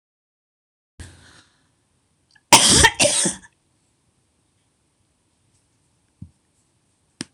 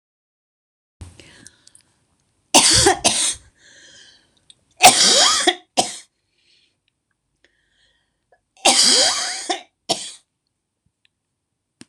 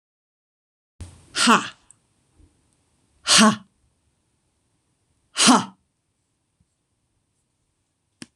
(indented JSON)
{
  "cough_length": "7.3 s",
  "cough_amplitude": 26028,
  "cough_signal_mean_std_ratio": 0.24,
  "three_cough_length": "11.9 s",
  "three_cough_amplitude": 26028,
  "three_cough_signal_mean_std_ratio": 0.35,
  "exhalation_length": "8.4 s",
  "exhalation_amplitude": 26027,
  "exhalation_signal_mean_std_ratio": 0.24,
  "survey_phase": "beta (2021-08-13 to 2022-03-07)",
  "age": "65+",
  "gender": "Female",
  "wearing_mask": "No",
  "symptom_none": true,
  "smoker_status": "Ex-smoker",
  "respiratory_condition_asthma": false,
  "respiratory_condition_other": false,
  "recruitment_source": "REACT",
  "submission_delay": "2 days",
  "covid_test_result": "Negative",
  "covid_test_method": "RT-qPCR"
}